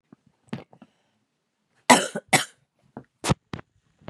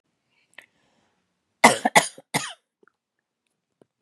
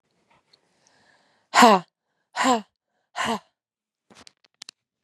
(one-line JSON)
{"cough_length": "4.1 s", "cough_amplitude": 32767, "cough_signal_mean_std_ratio": 0.22, "three_cough_length": "4.0 s", "three_cough_amplitude": 32767, "three_cough_signal_mean_std_ratio": 0.2, "exhalation_length": "5.0 s", "exhalation_amplitude": 31582, "exhalation_signal_mean_std_ratio": 0.25, "survey_phase": "beta (2021-08-13 to 2022-03-07)", "age": "45-64", "gender": "Female", "wearing_mask": "No", "symptom_cough_any": true, "symptom_runny_or_blocked_nose": true, "symptom_sore_throat": true, "symptom_fatigue": true, "symptom_headache": true, "symptom_onset": "3 days", "smoker_status": "Never smoked", "respiratory_condition_asthma": false, "respiratory_condition_other": false, "recruitment_source": "Test and Trace", "submission_delay": "1 day", "covid_test_result": "Positive", "covid_test_method": "RT-qPCR", "covid_ct_value": 30.0, "covid_ct_gene": "N gene"}